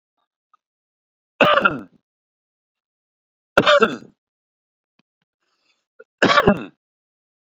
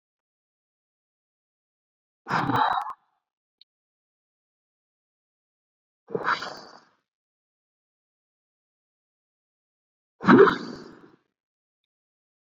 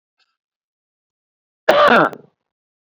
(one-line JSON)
{"three_cough_length": "7.4 s", "three_cough_amplitude": 32767, "three_cough_signal_mean_std_ratio": 0.28, "exhalation_length": "12.5 s", "exhalation_amplitude": 24903, "exhalation_signal_mean_std_ratio": 0.21, "cough_length": "3.0 s", "cough_amplitude": 28029, "cough_signal_mean_std_ratio": 0.3, "survey_phase": "beta (2021-08-13 to 2022-03-07)", "age": "45-64", "gender": "Male", "wearing_mask": "No", "symptom_cough_any": true, "smoker_status": "Current smoker (11 or more cigarettes per day)", "respiratory_condition_asthma": false, "respiratory_condition_other": false, "recruitment_source": "REACT", "submission_delay": "0 days", "covid_test_result": "Negative", "covid_test_method": "RT-qPCR"}